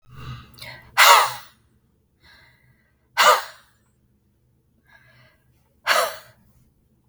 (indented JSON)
{
  "exhalation_length": "7.1 s",
  "exhalation_amplitude": 32768,
  "exhalation_signal_mean_std_ratio": 0.28,
  "survey_phase": "beta (2021-08-13 to 2022-03-07)",
  "age": "18-44",
  "gender": "Female",
  "wearing_mask": "No",
  "symptom_none": true,
  "smoker_status": "Ex-smoker",
  "respiratory_condition_asthma": false,
  "respiratory_condition_other": false,
  "recruitment_source": "REACT",
  "submission_delay": "7 days",
  "covid_test_result": "Negative",
  "covid_test_method": "RT-qPCR",
  "influenza_a_test_result": "Unknown/Void",
  "influenza_b_test_result": "Unknown/Void"
}